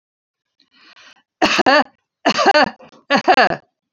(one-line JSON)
{"three_cough_length": "3.9 s", "three_cough_amplitude": 32767, "three_cough_signal_mean_std_ratio": 0.43, "survey_phase": "beta (2021-08-13 to 2022-03-07)", "age": "65+", "gender": "Female", "wearing_mask": "No", "symptom_none": true, "smoker_status": "Never smoked", "respiratory_condition_asthma": false, "respiratory_condition_other": false, "recruitment_source": "REACT", "submission_delay": "1 day", "covid_test_result": "Negative", "covid_test_method": "RT-qPCR", "influenza_a_test_result": "Unknown/Void", "influenza_b_test_result": "Unknown/Void"}